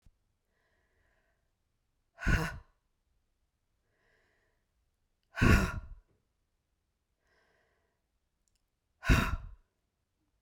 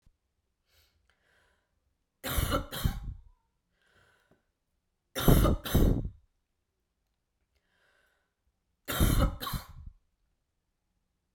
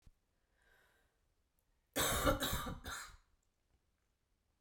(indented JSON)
{
  "exhalation_length": "10.4 s",
  "exhalation_amplitude": 9841,
  "exhalation_signal_mean_std_ratio": 0.23,
  "three_cough_length": "11.3 s",
  "three_cough_amplitude": 13966,
  "three_cough_signal_mean_std_ratio": 0.32,
  "cough_length": "4.6 s",
  "cough_amplitude": 4629,
  "cough_signal_mean_std_ratio": 0.36,
  "survey_phase": "beta (2021-08-13 to 2022-03-07)",
  "age": "45-64",
  "gender": "Female",
  "wearing_mask": "No",
  "symptom_cough_any": true,
  "symptom_runny_or_blocked_nose": true,
  "symptom_sore_throat": true,
  "symptom_headache": true,
  "smoker_status": "Never smoked",
  "respiratory_condition_asthma": false,
  "respiratory_condition_other": false,
  "recruitment_source": "Test and Trace",
  "submission_delay": "1 day",
  "covid_test_result": "Positive",
  "covid_test_method": "RT-qPCR",
  "covid_ct_value": 19.8,
  "covid_ct_gene": "ORF1ab gene"
}